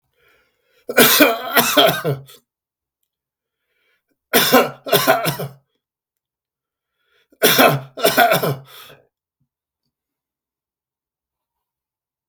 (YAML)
three_cough_length: 12.3 s
three_cough_amplitude: 32768
three_cough_signal_mean_std_ratio: 0.37
survey_phase: beta (2021-08-13 to 2022-03-07)
age: 65+
gender: Male
wearing_mask: 'No'
symptom_none: true
smoker_status: Never smoked
respiratory_condition_asthma: false
respiratory_condition_other: false
recruitment_source: REACT
submission_delay: 2 days
covid_test_result: Negative
covid_test_method: RT-qPCR
influenza_a_test_result: Negative
influenza_b_test_result: Negative